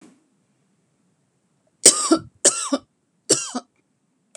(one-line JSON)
{"three_cough_length": "4.4 s", "three_cough_amplitude": 32768, "three_cough_signal_mean_std_ratio": 0.27, "survey_phase": "beta (2021-08-13 to 2022-03-07)", "age": "45-64", "gender": "Female", "wearing_mask": "No", "symptom_none": true, "smoker_status": "Never smoked", "respiratory_condition_asthma": false, "respiratory_condition_other": false, "recruitment_source": "REACT", "submission_delay": "3 days", "covid_test_result": "Negative", "covid_test_method": "RT-qPCR"}